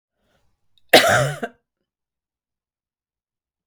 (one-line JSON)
{"cough_length": "3.7 s", "cough_amplitude": 32768, "cough_signal_mean_std_ratio": 0.25, "survey_phase": "beta (2021-08-13 to 2022-03-07)", "age": "65+", "gender": "Female", "wearing_mask": "No", "symptom_none": true, "smoker_status": "Ex-smoker", "respiratory_condition_asthma": false, "respiratory_condition_other": false, "recruitment_source": "REACT", "submission_delay": "1 day", "covid_test_result": "Negative", "covid_test_method": "RT-qPCR", "influenza_a_test_result": "Negative", "influenza_b_test_result": "Negative"}